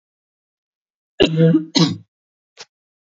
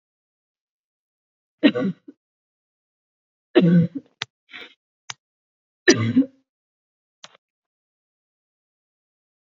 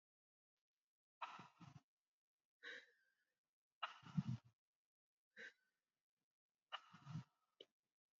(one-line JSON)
{"cough_length": "3.2 s", "cough_amplitude": 32723, "cough_signal_mean_std_ratio": 0.34, "three_cough_length": "9.6 s", "three_cough_amplitude": 27946, "three_cough_signal_mean_std_ratio": 0.24, "exhalation_length": "8.2 s", "exhalation_amplitude": 1055, "exhalation_signal_mean_std_ratio": 0.26, "survey_phase": "beta (2021-08-13 to 2022-03-07)", "age": "18-44", "gender": "Female", "wearing_mask": "No", "symptom_cough_any": true, "symptom_new_continuous_cough": true, "symptom_runny_or_blocked_nose": true, "symptom_sore_throat": true, "symptom_fatigue": true, "symptom_fever_high_temperature": true, "symptom_headache": true, "symptom_change_to_sense_of_smell_or_taste": true, "symptom_onset": "3 days", "smoker_status": "Never smoked", "respiratory_condition_asthma": false, "respiratory_condition_other": false, "recruitment_source": "Test and Trace", "submission_delay": "0 days", "covid_test_result": "Positive", "covid_test_method": "RT-qPCR", "covid_ct_value": 23.0, "covid_ct_gene": "ORF1ab gene"}